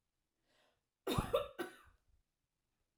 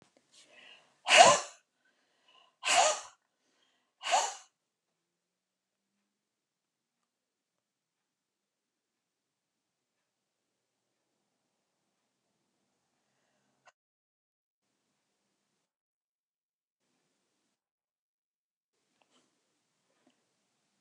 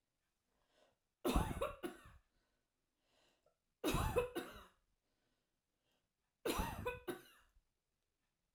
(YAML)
cough_length: 3.0 s
cough_amplitude: 2674
cough_signal_mean_std_ratio: 0.3
exhalation_length: 20.8 s
exhalation_amplitude: 20253
exhalation_signal_mean_std_ratio: 0.15
three_cough_length: 8.5 s
three_cough_amplitude: 2552
three_cough_signal_mean_std_ratio: 0.36
survey_phase: alpha (2021-03-01 to 2021-08-12)
age: 45-64
gender: Female
wearing_mask: 'No'
symptom_none: true
smoker_status: Never smoked
respiratory_condition_asthma: false
respiratory_condition_other: false
recruitment_source: REACT
submission_delay: 1 day
covid_test_result: Negative
covid_test_method: RT-qPCR